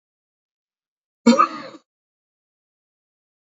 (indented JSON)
{
  "cough_length": "3.5 s",
  "cough_amplitude": 29581,
  "cough_signal_mean_std_ratio": 0.2,
  "survey_phase": "beta (2021-08-13 to 2022-03-07)",
  "age": "45-64",
  "gender": "Male",
  "wearing_mask": "No",
  "symptom_none": true,
  "smoker_status": "Never smoked",
  "respiratory_condition_asthma": false,
  "respiratory_condition_other": false,
  "recruitment_source": "REACT",
  "submission_delay": "3 days",
  "covid_test_result": "Negative",
  "covid_test_method": "RT-qPCR",
  "influenza_a_test_result": "Negative",
  "influenza_b_test_result": "Negative"
}